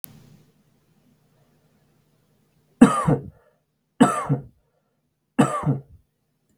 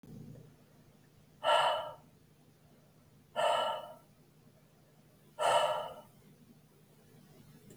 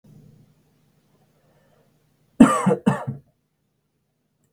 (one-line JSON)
{"three_cough_length": "6.6 s", "three_cough_amplitude": 32768, "three_cough_signal_mean_std_ratio": 0.27, "exhalation_length": "7.8 s", "exhalation_amplitude": 5313, "exhalation_signal_mean_std_ratio": 0.39, "cough_length": "4.5 s", "cough_amplitude": 32768, "cough_signal_mean_std_ratio": 0.23, "survey_phase": "beta (2021-08-13 to 2022-03-07)", "age": "18-44", "gender": "Male", "wearing_mask": "No", "symptom_none": true, "smoker_status": "Never smoked", "respiratory_condition_asthma": true, "respiratory_condition_other": false, "recruitment_source": "REACT", "submission_delay": "14 days", "covid_test_result": "Negative", "covid_test_method": "RT-qPCR"}